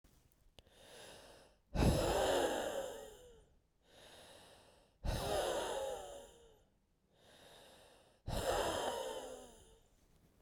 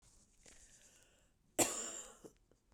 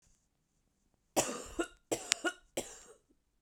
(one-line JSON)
{"exhalation_length": "10.4 s", "exhalation_amplitude": 3547, "exhalation_signal_mean_std_ratio": 0.51, "cough_length": "2.7 s", "cough_amplitude": 5123, "cough_signal_mean_std_ratio": 0.3, "three_cough_length": "3.4 s", "three_cough_amplitude": 30712, "three_cough_signal_mean_std_ratio": 0.31, "survey_phase": "beta (2021-08-13 to 2022-03-07)", "age": "18-44", "gender": "Female", "wearing_mask": "No", "symptom_none": true, "smoker_status": "Current smoker (1 to 10 cigarettes per day)", "respiratory_condition_asthma": true, "respiratory_condition_other": false, "recruitment_source": "REACT", "submission_delay": "1 day", "covid_test_result": "Negative", "covid_test_method": "RT-qPCR", "influenza_a_test_result": "Negative", "influenza_b_test_result": "Negative"}